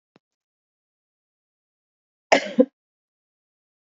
{"cough_length": "3.8 s", "cough_amplitude": 27089, "cough_signal_mean_std_ratio": 0.16, "survey_phase": "beta (2021-08-13 to 2022-03-07)", "age": "45-64", "gender": "Female", "wearing_mask": "No", "symptom_none": true, "smoker_status": "Current smoker (1 to 10 cigarettes per day)", "respiratory_condition_asthma": false, "respiratory_condition_other": false, "recruitment_source": "REACT", "submission_delay": "1 day", "covid_test_result": "Negative", "covid_test_method": "RT-qPCR"}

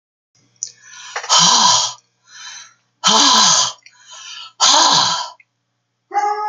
{"exhalation_length": "6.5 s", "exhalation_amplitude": 32768, "exhalation_signal_mean_std_ratio": 0.53, "survey_phase": "beta (2021-08-13 to 2022-03-07)", "age": "45-64", "gender": "Female", "wearing_mask": "No", "symptom_sore_throat": true, "smoker_status": "Never smoked", "respiratory_condition_asthma": false, "respiratory_condition_other": false, "recruitment_source": "Test and Trace", "submission_delay": "2 days", "covid_test_result": "Positive", "covid_test_method": "RT-qPCR", "covid_ct_value": 37.5, "covid_ct_gene": "N gene"}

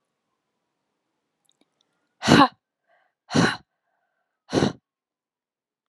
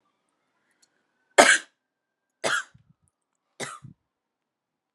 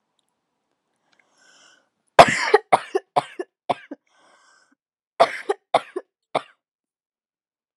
{"exhalation_length": "5.9 s", "exhalation_amplitude": 29546, "exhalation_signal_mean_std_ratio": 0.23, "three_cough_length": "4.9 s", "three_cough_amplitude": 32767, "three_cough_signal_mean_std_ratio": 0.2, "cough_length": "7.8 s", "cough_amplitude": 32768, "cough_signal_mean_std_ratio": 0.21, "survey_phase": "alpha (2021-03-01 to 2021-08-12)", "age": "18-44", "gender": "Female", "wearing_mask": "No", "symptom_cough_any": true, "smoker_status": "Never smoked", "respiratory_condition_asthma": false, "respiratory_condition_other": false, "recruitment_source": "Test and Trace", "submission_delay": "2 days", "covid_test_result": "Positive", "covid_test_method": "RT-qPCR", "covid_ct_value": 28.2, "covid_ct_gene": "ORF1ab gene", "covid_ct_mean": 28.7, "covid_viral_load": "370 copies/ml", "covid_viral_load_category": "Minimal viral load (< 10K copies/ml)"}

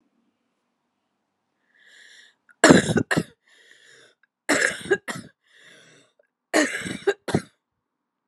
{"cough_length": "8.3 s", "cough_amplitude": 32768, "cough_signal_mean_std_ratio": 0.28, "survey_phase": "alpha (2021-03-01 to 2021-08-12)", "age": "18-44", "gender": "Female", "wearing_mask": "No", "symptom_cough_any": true, "symptom_shortness_of_breath": true, "symptom_fatigue": true, "symptom_onset": "2 days", "smoker_status": "Current smoker (e-cigarettes or vapes only)", "respiratory_condition_asthma": false, "respiratory_condition_other": false, "recruitment_source": "Test and Trace", "submission_delay": "2 days", "covid_test_result": "Positive", "covid_test_method": "RT-qPCR", "covid_ct_value": 30.0, "covid_ct_gene": "ORF1ab gene", "covid_ct_mean": 31.2, "covid_viral_load": "60 copies/ml", "covid_viral_load_category": "Minimal viral load (< 10K copies/ml)"}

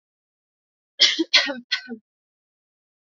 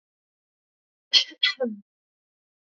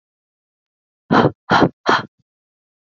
{"three_cough_length": "3.2 s", "three_cough_amplitude": 27440, "three_cough_signal_mean_std_ratio": 0.29, "cough_length": "2.7 s", "cough_amplitude": 22860, "cough_signal_mean_std_ratio": 0.25, "exhalation_length": "2.9 s", "exhalation_amplitude": 27394, "exhalation_signal_mean_std_ratio": 0.34, "survey_phase": "alpha (2021-03-01 to 2021-08-12)", "age": "18-44", "gender": "Female", "wearing_mask": "No", "symptom_cough_any": true, "symptom_headache": true, "symptom_onset": "5 days", "smoker_status": "Never smoked", "respiratory_condition_asthma": false, "respiratory_condition_other": false, "recruitment_source": "Test and Trace", "submission_delay": "2 days", "covid_test_result": "Positive", "covid_test_method": "RT-qPCR", "covid_ct_value": 16.2, "covid_ct_gene": "N gene", "covid_ct_mean": 16.3, "covid_viral_load": "4600000 copies/ml", "covid_viral_load_category": "High viral load (>1M copies/ml)"}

